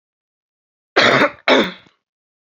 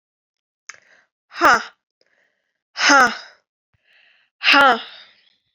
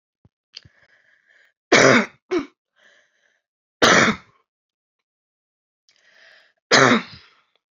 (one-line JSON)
{"cough_length": "2.6 s", "cough_amplitude": 31701, "cough_signal_mean_std_ratio": 0.37, "exhalation_length": "5.5 s", "exhalation_amplitude": 32767, "exhalation_signal_mean_std_ratio": 0.32, "three_cough_length": "7.8 s", "three_cough_amplitude": 31579, "three_cough_signal_mean_std_ratio": 0.29, "survey_phase": "alpha (2021-03-01 to 2021-08-12)", "age": "18-44", "gender": "Female", "wearing_mask": "No", "symptom_cough_any": true, "symptom_fatigue": true, "symptom_fever_high_temperature": true, "symptom_headache": true, "smoker_status": "Never smoked", "respiratory_condition_asthma": false, "respiratory_condition_other": false, "recruitment_source": "Test and Trace", "submission_delay": "2 days", "covid_test_result": "Positive", "covid_test_method": "RT-qPCR", "covid_ct_value": 18.4, "covid_ct_gene": "ORF1ab gene", "covid_ct_mean": 19.1, "covid_viral_load": "550000 copies/ml", "covid_viral_load_category": "Low viral load (10K-1M copies/ml)"}